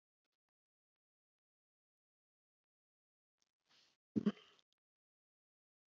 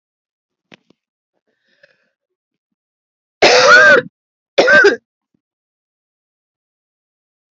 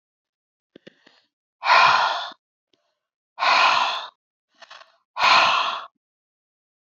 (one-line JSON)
{"three_cough_length": "5.9 s", "three_cough_amplitude": 2003, "three_cough_signal_mean_std_ratio": 0.11, "cough_length": "7.6 s", "cough_amplitude": 31546, "cough_signal_mean_std_ratio": 0.31, "exhalation_length": "6.9 s", "exhalation_amplitude": 24110, "exhalation_signal_mean_std_ratio": 0.41, "survey_phase": "beta (2021-08-13 to 2022-03-07)", "age": "45-64", "gender": "Female", "wearing_mask": "No", "symptom_none": true, "smoker_status": "Never smoked", "respiratory_condition_asthma": false, "respiratory_condition_other": false, "recruitment_source": "REACT", "submission_delay": "1 day", "covid_test_result": "Negative", "covid_test_method": "RT-qPCR"}